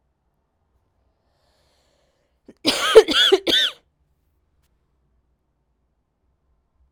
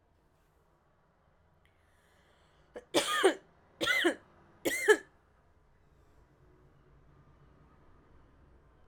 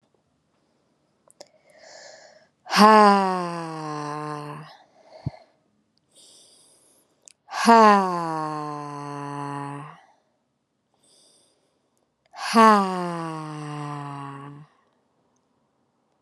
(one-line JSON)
{"cough_length": "6.9 s", "cough_amplitude": 32768, "cough_signal_mean_std_ratio": 0.24, "three_cough_length": "8.9 s", "three_cough_amplitude": 11273, "three_cough_signal_mean_std_ratio": 0.27, "exhalation_length": "16.2 s", "exhalation_amplitude": 32475, "exhalation_signal_mean_std_ratio": 0.32, "survey_phase": "alpha (2021-03-01 to 2021-08-12)", "age": "18-44", "gender": "Female", "wearing_mask": "No", "symptom_cough_any": true, "symptom_fatigue": true, "symptom_headache": true, "symptom_onset": "3 days", "smoker_status": "Ex-smoker", "respiratory_condition_asthma": false, "respiratory_condition_other": false, "recruitment_source": "Test and Trace", "submission_delay": "2 days", "covid_test_result": "Positive", "covid_test_method": "RT-qPCR"}